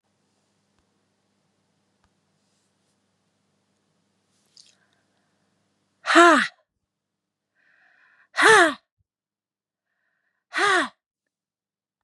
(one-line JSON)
{"exhalation_length": "12.0 s", "exhalation_amplitude": 27416, "exhalation_signal_mean_std_ratio": 0.22, "survey_phase": "beta (2021-08-13 to 2022-03-07)", "age": "45-64", "gender": "Female", "wearing_mask": "No", "symptom_none": true, "smoker_status": "Never smoked", "respiratory_condition_asthma": false, "respiratory_condition_other": false, "recruitment_source": "REACT", "submission_delay": "1 day", "covid_test_result": "Negative", "covid_test_method": "RT-qPCR", "influenza_a_test_result": "Negative", "influenza_b_test_result": "Negative"}